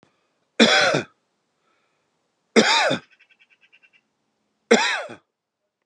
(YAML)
three_cough_length: 5.9 s
three_cough_amplitude: 30820
three_cough_signal_mean_std_ratio: 0.34
survey_phase: beta (2021-08-13 to 2022-03-07)
age: 45-64
gender: Male
wearing_mask: 'No'
symptom_none: true
smoker_status: Ex-smoker
respiratory_condition_asthma: false
respiratory_condition_other: false
recruitment_source: REACT
submission_delay: 2 days
covid_test_result: Negative
covid_test_method: RT-qPCR